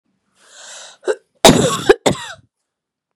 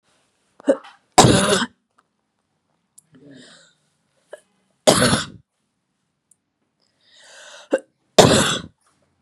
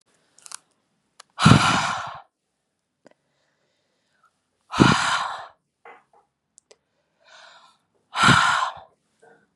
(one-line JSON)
{"cough_length": "3.2 s", "cough_amplitude": 32768, "cough_signal_mean_std_ratio": 0.33, "three_cough_length": "9.2 s", "three_cough_amplitude": 32768, "three_cough_signal_mean_std_ratio": 0.29, "exhalation_length": "9.6 s", "exhalation_amplitude": 32768, "exhalation_signal_mean_std_ratio": 0.32, "survey_phase": "beta (2021-08-13 to 2022-03-07)", "age": "18-44", "gender": "Female", "wearing_mask": "No", "symptom_runny_or_blocked_nose": true, "symptom_fatigue": true, "smoker_status": "Never smoked", "respiratory_condition_asthma": false, "respiratory_condition_other": false, "recruitment_source": "Test and Trace", "submission_delay": "2 days", "covid_test_result": "Positive", "covid_test_method": "RT-qPCR"}